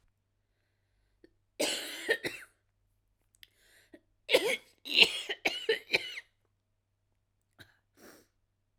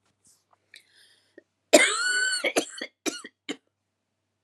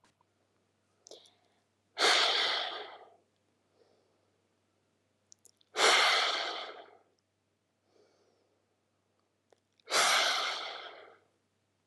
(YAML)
three_cough_length: 8.8 s
three_cough_amplitude: 23230
three_cough_signal_mean_std_ratio: 0.29
cough_length: 4.4 s
cough_amplitude: 28978
cough_signal_mean_std_ratio: 0.34
exhalation_length: 11.9 s
exhalation_amplitude: 9321
exhalation_signal_mean_std_ratio: 0.37
survey_phase: alpha (2021-03-01 to 2021-08-12)
age: 18-44
gender: Female
wearing_mask: 'No'
symptom_cough_any: true
symptom_fatigue: true
symptom_fever_high_temperature: true
symptom_headache: true
symptom_change_to_sense_of_smell_or_taste: true
symptom_loss_of_taste: true
symptom_onset: 2 days
smoker_status: Never smoked
respiratory_condition_asthma: false
respiratory_condition_other: false
recruitment_source: Test and Trace
submission_delay: 1 day
covid_test_result: Positive
covid_test_method: RT-qPCR